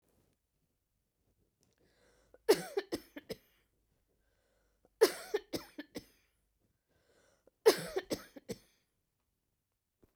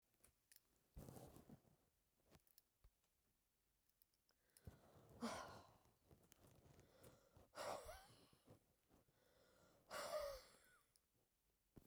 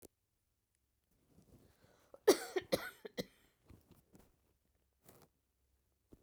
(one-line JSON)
{"three_cough_length": "10.2 s", "three_cough_amplitude": 7793, "three_cough_signal_mean_std_ratio": 0.2, "exhalation_length": "11.9 s", "exhalation_amplitude": 455, "exhalation_signal_mean_std_ratio": 0.4, "cough_length": "6.2 s", "cough_amplitude": 5876, "cough_signal_mean_std_ratio": 0.18, "survey_phase": "beta (2021-08-13 to 2022-03-07)", "age": "65+", "gender": "Female", "wearing_mask": "No", "symptom_none": true, "smoker_status": "Never smoked", "respiratory_condition_asthma": false, "respiratory_condition_other": false, "recruitment_source": "REACT", "submission_delay": "1 day", "covid_test_result": "Negative", "covid_test_method": "RT-qPCR"}